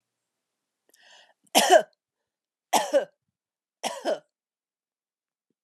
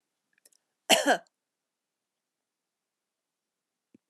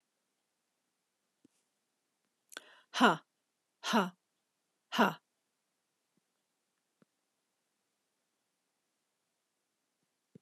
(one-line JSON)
{"three_cough_length": "5.6 s", "three_cough_amplitude": 20138, "three_cough_signal_mean_std_ratio": 0.26, "cough_length": "4.1 s", "cough_amplitude": 16915, "cough_signal_mean_std_ratio": 0.18, "exhalation_length": "10.4 s", "exhalation_amplitude": 8651, "exhalation_signal_mean_std_ratio": 0.17, "survey_phase": "beta (2021-08-13 to 2022-03-07)", "age": "45-64", "gender": "Female", "wearing_mask": "No", "symptom_none": true, "smoker_status": "Never smoked", "respiratory_condition_asthma": false, "respiratory_condition_other": false, "recruitment_source": "REACT", "submission_delay": "2 days", "covid_test_result": "Negative", "covid_test_method": "RT-qPCR"}